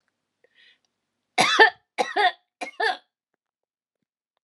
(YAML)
three_cough_length: 4.4 s
three_cough_amplitude: 25845
three_cough_signal_mean_std_ratio: 0.3
survey_phase: beta (2021-08-13 to 2022-03-07)
age: 45-64
gender: Female
wearing_mask: 'No'
symptom_none: true
smoker_status: Ex-smoker
respiratory_condition_asthma: false
respiratory_condition_other: false
recruitment_source: REACT
submission_delay: 1 day
covid_test_result: Negative
covid_test_method: RT-qPCR